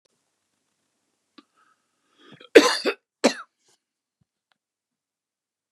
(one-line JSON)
{"cough_length": "5.7 s", "cough_amplitude": 32768, "cough_signal_mean_std_ratio": 0.17, "survey_phase": "beta (2021-08-13 to 2022-03-07)", "age": "65+", "gender": "Male", "wearing_mask": "No", "symptom_none": true, "smoker_status": "Ex-smoker", "respiratory_condition_asthma": false, "respiratory_condition_other": false, "recruitment_source": "REACT", "submission_delay": "2 days", "covid_test_result": "Negative", "covid_test_method": "RT-qPCR", "influenza_a_test_result": "Negative", "influenza_b_test_result": "Negative"}